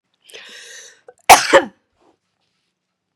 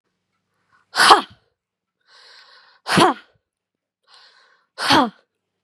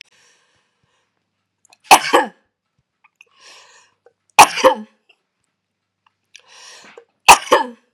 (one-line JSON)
{"cough_length": "3.2 s", "cough_amplitude": 32768, "cough_signal_mean_std_ratio": 0.23, "exhalation_length": "5.6 s", "exhalation_amplitude": 32768, "exhalation_signal_mean_std_ratio": 0.28, "three_cough_length": "7.9 s", "three_cough_amplitude": 32768, "three_cough_signal_mean_std_ratio": 0.23, "survey_phase": "beta (2021-08-13 to 2022-03-07)", "age": "45-64", "gender": "Female", "wearing_mask": "No", "symptom_cough_any": true, "symptom_sore_throat": true, "smoker_status": "Never smoked", "respiratory_condition_asthma": true, "respiratory_condition_other": false, "recruitment_source": "REACT", "submission_delay": "3 days", "covid_test_result": "Negative", "covid_test_method": "RT-qPCR", "influenza_a_test_result": "Negative", "influenza_b_test_result": "Negative"}